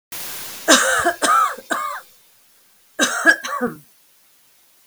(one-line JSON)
{"three_cough_length": "4.9 s", "three_cough_amplitude": 32768, "three_cough_signal_mean_std_ratio": 0.49, "survey_phase": "beta (2021-08-13 to 2022-03-07)", "age": "65+", "gender": "Female", "wearing_mask": "No", "symptom_none": true, "smoker_status": "Never smoked", "respiratory_condition_asthma": false, "respiratory_condition_other": false, "recruitment_source": "REACT", "submission_delay": "1 day", "covid_test_result": "Negative", "covid_test_method": "RT-qPCR", "influenza_a_test_result": "Negative", "influenza_b_test_result": "Negative"}